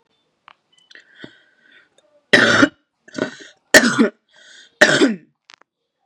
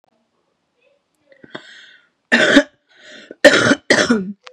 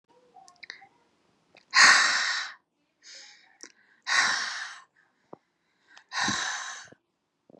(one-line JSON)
{"three_cough_length": "6.1 s", "three_cough_amplitude": 32768, "three_cough_signal_mean_std_ratio": 0.32, "cough_length": "4.5 s", "cough_amplitude": 32768, "cough_signal_mean_std_ratio": 0.37, "exhalation_length": "7.6 s", "exhalation_amplitude": 19512, "exhalation_signal_mean_std_ratio": 0.35, "survey_phase": "beta (2021-08-13 to 2022-03-07)", "age": "18-44", "gender": "Female", "wearing_mask": "No", "symptom_cough_any": true, "symptom_sore_throat": true, "symptom_fatigue": true, "symptom_headache": true, "symptom_onset": "2 days", "smoker_status": "Ex-smoker", "respiratory_condition_asthma": false, "respiratory_condition_other": false, "recruitment_source": "Test and Trace", "submission_delay": "2 days", "covid_test_result": "Positive", "covid_test_method": "ePCR"}